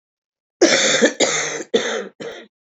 {"cough_length": "2.7 s", "cough_amplitude": 30791, "cough_signal_mean_std_ratio": 0.55, "survey_phase": "alpha (2021-03-01 to 2021-08-12)", "age": "45-64", "gender": "Female", "wearing_mask": "No", "symptom_cough_any": true, "symptom_shortness_of_breath": true, "symptom_fatigue": true, "symptom_headache": true, "symptom_onset": "3 days", "smoker_status": "Ex-smoker", "respiratory_condition_asthma": true, "respiratory_condition_other": false, "recruitment_source": "Test and Trace", "submission_delay": "1 day", "covid_test_result": "Positive", "covid_test_method": "RT-qPCR", "covid_ct_value": 11.9, "covid_ct_gene": "S gene", "covid_ct_mean": 12.1, "covid_viral_load": "110000000 copies/ml", "covid_viral_load_category": "High viral load (>1M copies/ml)"}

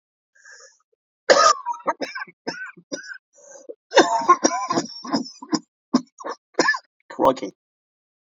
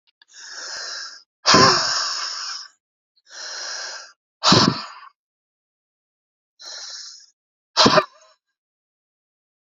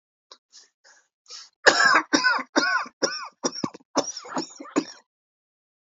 {"cough_length": "8.3 s", "cough_amplitude": 30339, "cough_signal_mean_std_ratio": 0.38, "exhalation_length": "9.7 s", "exhalation_amplitude": 29740, "exhalation_signal_mean_std_ratio": 0.35, "three_cough_length": "5.8 s", "three_cough_amplitude": 28848, "three_cough_signal_mean_std_ratio": 0.4, "survey_phase": "beta (2021-08-13 to 2022-03-07)", "age": "45-64", "gender": "Male", "wearing_mask": "Yes", "symptom_cough_any": true, "symptom_runny_or_blocked_nose": true, "symptom_shortness_of_breath": true, "symptom_sore_throat": true, "symptom_diarrhoea": true, "symptom_fatigue": true, "symptom_fever_high_temperature": true, "symptom_headache": true, "symptom_onset": "2 days", "smoker_status": "Never smoked", "respiratory_condition_asthma": false, "respiratory_condition_other": false, "recruitment_source": "Test and Trace", "submission_delay": "2 days", "covid_test_result": "Positive", "covid_test_method": "RT-qPCR", "covid_ct_value": 22.1, "covid_ct_gene": "ORF1ab gene"}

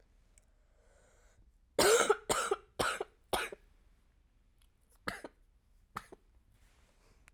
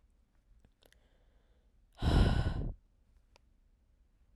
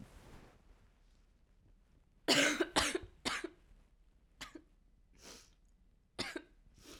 {"three_cough_length": "7.3 s", "three_cough_amplitude": 6617, "three_cough_signal_mean_std_ratio": 0.3, "exhalation_length": "4.4 s", "exhalation_amplitude": 6574, "exhalation_signal_mean_std_ratio": 0.33, "cough_length": "7.0 s", "cough_amplitude": 5369, "cough_signal_mean_std_ratio": 0.33, "survey_phase": "alpha (2021-03-01 to 2021-08-12)", "age": "18-44", "gender": "Female", "wearing_mask": "No", "symptom_cough_any": true, "symptom_fatigue": true, "symptom_headache": true, "symptom_change_to_sense_of_smell_or_taste": true, "symptom_onset": "3 days", "smoker_status": "Never smoked", "respiratory_condition_asthma": false, "respiratory_condition_other": false, "recruitment_source": "Test and Trace", "submission_delay": "1 day", "covid_test_result": "Positive", "covid_test_method": "RT-qPCR"}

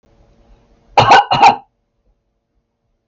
{"cough_length": "3.1 s", "cough_amplitude": 32001, "cough_signal_mean_std_ratio": 0.34, "survey_phase": "beta (2021-08-13 to 2022-03-07)", "age": "45-64", "gender": "Female", "wearing_mask": "No", "symptom_runny_or_blocked_nose": true, "symptom_onset": "12 days", "smoker_status": "Ex-smoker", "respiratory_condition_asthma": false, "respiratory_condition_other": false, "recruitment_source": "REACT", "submission_delay": "1 day", "covid_test_result": "Negative", "covid_test_method": "RT-qPCR"}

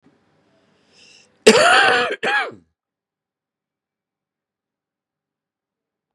{"cough_length": "6.1 s", "cough_amplitude": 32768, "cough_signal_mean_std_ratio": 0.29, "survey_phase": "beta (2021-08-13 to 2022-03-07)", "age": "45-64", "gender": "Male", "wearing_mask": "No", "symptom_cough_any": true, "symptom_runny_or_blocked_nose": true, "symptom_shortness_of_breath": true, "symptom_fatigue": true, "smoker_status": "Ex-smoker", "respiratory_condition_asthma": false, "respiratory_condition_other": false, "recruitment_source": "Test and Trace", "submission_delay": "2 days", "covid_test_result": "Positive", "covid_test_method": "RT-qPCR", "covid_ct_value": 18.6, "covid_ct_gene": "ORF1ab gene"}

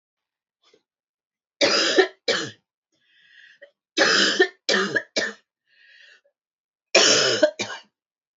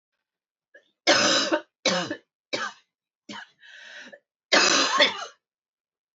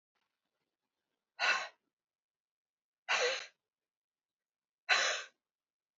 {"three_cough_length": "8.4 s", "three_cough_amplitude": 26727, "three_cough_signal_mean_std_ratio": 0.41, "cough_length": "6.1 s", "cough_amplitude": 19003, "cough_signal_mean_std_ratio": 0.42, "exhalation_length": "6.0 s", "exhalation_amplitude": 5757, "exhalation_signal_mean_std_ratio": 0.3, "survey_phase": "alpha (2021-03-01 to 2021-08-12)", "age": "45-64", "gender": "Female", "wearing_mask": "No", "symptom_cough_any": true, "symptom_abdominal_pain": true, "symptom_headache": true, "smoker_status": "Never smoked", "respiratory_condition_asthma": true, "respiratory_condition_other": false, "recruitment_source": "Test and Trace", "submission_delay": "1 day", "covid_test_result": "Positive", "covid_test_method": "LFT"}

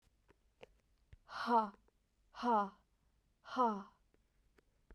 {"exhalation_length": "4.9 s", "exhalation_amplitude": 2926, "exhalation_signal_mean_std_ratio": 0.34, "survey_phase": "beta (2021-08-13 to 2022-03-07)", "age": "18-44", "gender": "Female", "wearing_mask": "No", "symptom_diarrhoea": true, "symptom_fatigue": true, "symptom_headache": true, "symptom_onset": "3 days", "smoker_status": "Never smoked", "respiratory_condition_asthma": false, "respiratory_condition_other": false, "recruitment_source": "Test and Trace", "submission_delay": "1 day", "covid_test_result": "Positive", "covid_test_method": "RT-qPCR", "covid_ct_value": 17.4, "covid_ct_gene": "ORF1ab gene"}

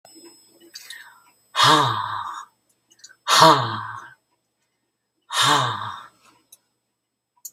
{"exhalation_length": "7.5 s", "exhalation_amplitude": 32204, "exhalation_signal_mean_std_ratio": 0.37, "survey_phase": "beta (2021-08-13 to 2022-03-07)", "age": "65+", "gender": "Female", "wearing_mask": "No", "symptom_none": true, "smoker_status": "Ex-smoker", "respiratory_condition_asthma": false, "respiratory_condition_other": false, "recruitment_source": "REACT", "submission_delay": "1 day", "covid_test_result": "Negative", "covid_test_method": "RT-qPCR", "influenza_a_test_result": "Negative", "influenza_b_test_result": "Negative"}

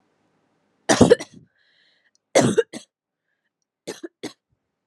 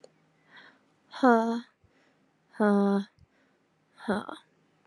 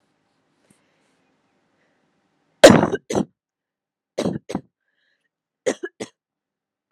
{"cough_length": "4.9 s", "cough_amplitude": 29745, "cough_signal_mean_std_ratio": 0.25, "exhalation_length": "4.9 s", "exhalation_amplitude": 12286, "exhalation_signal_mean_std_ratio": 0.36, "three_cough_length": "6.9 s", "three_cough_amplitude": 32768, "three_cough_signal_mean_std_ratio": 0.19, "survey_phase": "alpha (2021-03-01 to 2021-08-12)", "age": "18-44", "gender": "Female", "wearing_mask": "No", "symptom_fatigue": true, "symptom_onset": "8 days", "smoker_status": "Current smoker (1 to 10 cigarettes per day)", "respiratory_condition_asthma": false, "respiratory_condition_other": false, "recruitment_source": "Test and Trace", "submission_delay": "1 day", "covid_test_result": "Positive", "covid_test_method": "RT-qPCR"}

